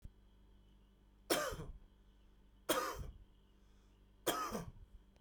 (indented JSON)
{
  "three_cough_length": "5.2 s",
  "three_cough_amplitude": 3305,
  "three_cough_signal_mean_std_ratio": 0.43,
  "survey_phase": "beta (2021-08-13 to 2022-03-07)",
  "age": "45-64",
  "gender": "Male",
  "wearing_mask": "No",
  "symptom_none": true,
  "smoker_status": "Never smoked",
  "respiratory_condition_asthma": false,
  "respiratory_condition_other": false,
  "recruitment_source": "REACT",
  "submission_delay": "2 days",
  "covid_test_result": "Negative",
  "covid_test_method": "RT-qPCR",
  "influenza_a_test_result": "Negative",
  "influenza_b_test_result": "Negative"
}